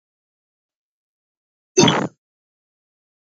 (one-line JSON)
{"cough_length": "3.3 s", "cough_amplitude": 29423, "cough_signal_mean_std_ratio": 0.22, "survey_phase": "beta (2021-08-13 to 2022-03-07)", "age": "45-64", "gender": "Female", "wearing_mask": "No", "symptom_runny_or_blocked_nose": true, "symptom_sore_throat": true, "smoker_status": "Never smoked", "respiratory_condition_asthma": false, "respiratory_condition_other": false, "recruitment_source": "Test and Trace", "submission_delay": "0 days", "covid_test_result": "Positive", "covid_test_method": "RT-qPCR", "covid_ct_value": 17.5, "covid_ct_gene": "ORF1ab gene", "covid_ct_mean": 18.2, "covid_viral_load": "1100000 copies/ml", "covid_viral_load_category": "High viral load (>1M copies/ml)"}